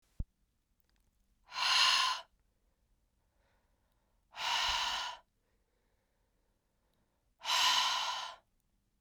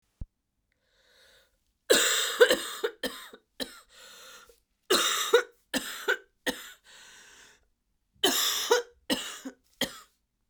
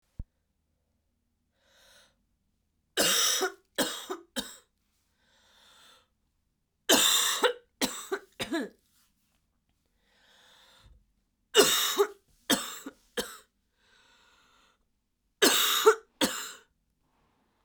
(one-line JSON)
{"exhalation_length": "9.0 s", "exhalation_amplitude": 5887, "exhalation_signal_mean_std_ratio": 0.41, "cough_length": "10.5 s", "cough_amplitude": 18255, "cough_signal_mean_std_ratio": 0.38, "three_cough_length": "17.6 s", "three_cough_amplitude": 15255, "three_cough_signal_mean_std_ratio": 0.33, "survey_phase": "beta (2021-08-13 to 2022-03-07)", "age": "18-44", "gender": "Female", "wearing_mask": "No", "symptom_cough_any": true, "symptom_runny_or_blocked_nose": true, "symptom_shortness_of_breath": true, "symptom_sore_throat": true, "symptom_fatigue": true, "symptom_headache": true, "symptom_other": true, "smoker_status": "Never smoked", "respiratory_condition_asthma": false, "respiratory_condition_other": false, "recruitment_source": "Test and Trace", "submission_delay": "2 days", "covid_test_result": "Positive", "covid_test_method": "LFT"}